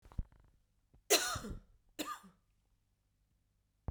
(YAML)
cough_length: 3.9 s
cough_amplitude: 5963
cough_signal_mean_std_ratio: 0.28
survey_phase: beta (2021-08-13 to 2022-03-07)
age: 18-44
gender: Female
wearing_mask: 'No'
symptom_cough_any: true
symptom_runny_or_blocked_nose: true
symptom_shortness_of_breath: true
symptom_fatigue: true
symptom_headache: true
symptom_onset: 2 days
smoker_status: Never smoked
respiratory_condition_asthma: false
respiratory_condition_other: false
recruitment_source: Test and Trace
submission_delay: 2 days
covid_test_result: Positive
covid_test_method: RT-qPCR
covid_ct_value: 22.4
covid_ct_gene: ORF1ab gene
covid_ct_mean: 23.0
covid_viral_load: 28000 copies/ml
covid_viral_load_category: Low viral load (10K-1M copies/ml)